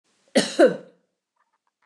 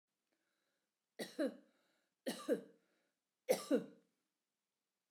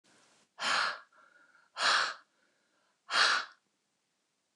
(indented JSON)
{
  "cough_length": "1.9 s",
  "cough_amplitude": 20149,
  "cough_signal_mean_std_ratio": 0.3,
  "three_cough_length": "5.1 s",
  "three_cough_amplitude": 3027,
  "three_cough_signal_mean_std_ratio": 0.28,
  "exhalation_length": "4.6 s",
  "exhalation_amplitude": 7169,
  "exhalation_signal_mean_std_ratio": 0.39,
  "survey_phase": "beta (2021-08-13 to 2022-03-07)",
  "age": "65+",
  "gender": "Female",
  "wearing_mask": "No",
  "symptom_none": true,
  "smoker_status": "Never smoked",
  "respiratory_condition_asthma": false,
  "respiratory_condition_other": false,
  "recruitment_source": "REACT",
  "submission_delay": "2 days",
  "covid_test_result": "Negative",
  "covid_test_method": "RT-qPCR"
}